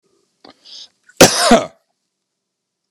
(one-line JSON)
{"cough_length": "2.9 s", "cough_amplitude": 32768, "cough_signal_mean_std_ratio": 0.28, "survey_phase": "beta (2021-08-13 to 2022-03-07)", "age": "65+", "gender": "Male", "wearing_mask": "No", "symptom_cough_any": true, "symptom_sore_throat": true, "symptom_onset": "12 days", "smoker_status": "Never smoked", "respiratory_condition_asthma": false, "respiratory_condition_other": false, "recruitment_source": "REACT", "submission_delay": "1 day", "covid_test_result": "Negative", "covid_test_method": "RT-qPCR"}